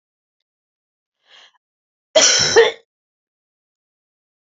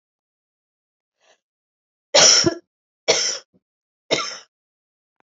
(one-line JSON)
{"cough_length": "4.4 s", "cough_amplitude": 30174, "cough_signal_mean_std_ratio": 0.27, "three_cough_length": "5.3 s", "three_cough_amplitude": 32767, "three_cough_signal_mean_std_ratio": 0.29, "survey_phase": "alpha (2021-03-01 to 2021-08-12)", "age": "45-64", "gender": "Female", "wearing_mask": "No", "symptom_shortness_of_breath": true, "symptom_fatigue": true, "smoker_status": "Current smoker (e-cigarettes or vapes only)", "respiratory_condition_asthma": false, "respiratory_condition_other": false, "recruitment_source": "Test and Trace", "submission_delay": "2 days", "covid_test_result": "Positive", "covid_test_method": "RT-qPCR", "covid_ct_value": 23.2, "covid_ct_gene": "N gene", "covid_ct_mean": 23.3, "covid_viral_load": "23000 copies/ml", "covid_viral_load_category": "Low viral load (10K-1M copies/ml)"}